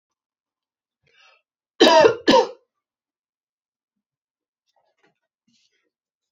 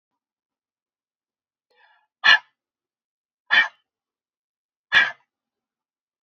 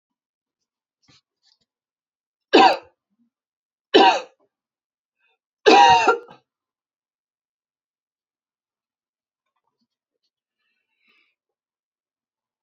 {
  "cough_length": "6.3 s",
  "cough_amplitude": 27218,
  "cough_signal_mean_std_ratio": 0.23,
  "exhalation_length": "6.2 s",
  "exhalation_amplitude": 32767,
  "exhalation_signal_mean_std_ratio": 0.21,
  "three_cough_length": "12.6 s",
  "three_cough_amplitude": 27776,
  "three_cough_signal_mean_std_ratio": 0.22,
  "survey_phase": "beta (2021-08-13 to 2022-03-07)",
  "age": "18-44",
  "gender": "Female",
  "wearing_mask": "No",
  "symptom_runny_or_blocked_nose": true,
  "smoker_status": "Ex-smoker",
  "respiratory_condition_asthma": false,
  "respiratory_condition_other": false,
  "recruitment_source": "REACT",
  "submission_delay": "0 days",
  "covid_test_result": "Negative",
  "covid_test_method": "RT-qPCR"
}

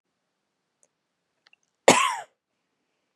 {
  "cough_length": "3.2 s",
  "cough_amplitude": 30566,
  "cough_signal_mean_std_ratio": 0.2,
  "survey_phase": "beta (2021-08-13 to 2022-03-07)",
  "age": "18-44",
  "gender": "Female",
  "wearing_mask": "Yes",
  "symptom_cough_any": true,
  "symptom_runny_or_blocked_nose": true,
  "symptom_fatigue": true,
  "symptom_headache": true,
  "symptom_change_to_sense_of_smell_or_taste": true,
  "symptom_other": true,
  "symptom_onset": "3 days",
  "smoker_status": "Never smoked",
  "respiratory_condition_asthma": true,
  "respiratory_condition_other": false,
  "recruitment_source": "Test and Trace",
  "submission_delay": "1 day",
  "covid_test_result": "Positive",
  "covid_test_method": "RT-qPCR",
  "covid_ct_value": 18.3,
  "covid_ct_gene": "N gene",
  "covid_ct_mean": 18.3,
  "covid_viral_load": "970000 copies/ml",
  "covid_viral_load_category": "Low viral load (10K-1M copies/ml)"
}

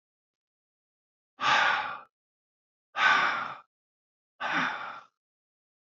{
  "exhalation_length": "5.8 s",
  "exhalation_amplitude": 10680,
  "exhalation_signal_mean_std_ratio": 0.4,
  "survey_phase": "beta (2021-08-13 to 2022-03-07)",
  "age": "45-64",
  "gender": "Male",
  "wearing_mask": "No",
  "symptom_none": true,
  "smoker_status": "Current smoker (e-cigarettes or vapes only)",
  "respiratory_condition_asthma": false,
  "respiratory_condition_other": false,
  "recruitment_source": "REACT",
  "submission_delay": "1 day",
  "covid_test_result": "Negative",
  "covid_test_method": "RT-qPCR",
  "influenza_a_test_result": "Negative",
  "influenza_b_test_result": "Negative"
}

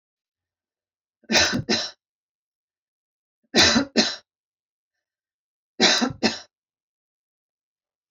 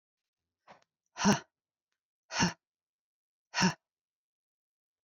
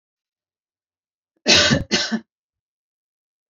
{
  "three_cough_length": "8.1 s",
  "three_cough_amplitude": 24773,
  "three_cough_signal_mean_std_ratio": 0.32,
  "exhalation_length": "5.0 s",
  "exhalation_amplitude": 7048,
  "exhalation_signal_mean_std_ratio": 0.25,
  "cough_length": "3.5 s",
  "cough_amplitude": 31109,
  "cough_signal_mean_std_ratio": 0.31,
  "survey_phase": "beta (2021-08-13 to 2022-03-07)",
  "age": "45-64",
  "gender": "Female",
  "wearing_mask": "No",
  "symptom_none": true,
  "smoker_status": "Never smoked",
  "respiratory_condition_asthma": false,
  "respiratory_condition_other": false,
  "recruitment_source": "REACT",
  "submission_delay": "1 day",
  "covid_test_result": "Negative",
  "covid_test_method": "RT-qPCR"
}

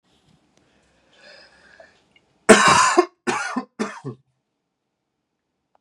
{
  "cough_length": "5.8 s",
  "cough_amplitude": 32768,
  "cough_signal_mean_std_ratio": 0.29,
  "survey_phase": "beta (2021-08-13 to 2022-03-07)",
  "age": "18-44",
  "gender": "Male",
  "wearing_mask": "No",
  "symptom_fatigue": true,
  "symptom_headache": true,
  "smoker_status": "Never smoked",
  "respiratory_condition_asthma": false,
  "respiratory_condition_other": false,
  "recruitment_source": "REACT",
  "submission_delay": "2 days",
  "covid_test_result": "Negative",
  "covid_test_method": "RT-qPCR",
  "influenza_a_test_result": "Negative",
  "influenza_b_test_result": "Negative"
}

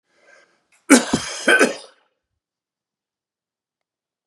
{
  "cough_length": "4.3 s",
  "cough_amplitude": 32677,
  "cough_signal_mean_std_ratio": 0.27,
  "survey_phase": "beta (2021-08-13 to 2022-03-07)",
  "age": "45-64",
  "gender": "Male",
  "wearing_mask": "No",
  "symptom_none": true,
  "smoker_status": "Never smoked",
  "respiratory_condition_asthma": false,
  "respiratory_condition_other": false,
  "recruitment_source": "REACT",
  "submission_delay": "2 days",
  "covid_test_method": "RT-qPCR",
  "influenza_a_test_result": "Unknown/Void",
  "influenza_b_test_result": "Unknown/Void"
}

